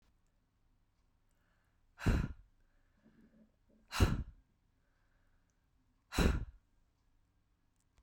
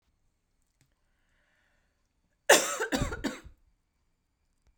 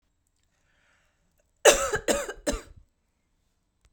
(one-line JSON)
{"exhalation_length": "8.0 s", "exhalation_amplitude": 5851, "exhalation_signal_mean_std_ratio": 0.26, "cough_length": "4.8 s", "cough_amplitude": 18794, "cough_signal_mean_std_ratio": 0.24, "three_cough_length": "3.9 s", "three_cough_amplitude": 25278, "three_cough_signal_mean_std_ratio": 0.27, "survey_phase": "beta (2021-08-13 to 2022-03-07)", "age": "45-64", "gender": "Female", "wearing_mask": "No", "symptom_none": true, "smoker_status": "Never smoked", "respiratory_condition_asthma": false, "respiratory_condition_other": false, "recruitment_source": "Test and Trace", "submission_delay": "1 day", "covid_test_result": "Negative", "covid_test_method": "ePCR"}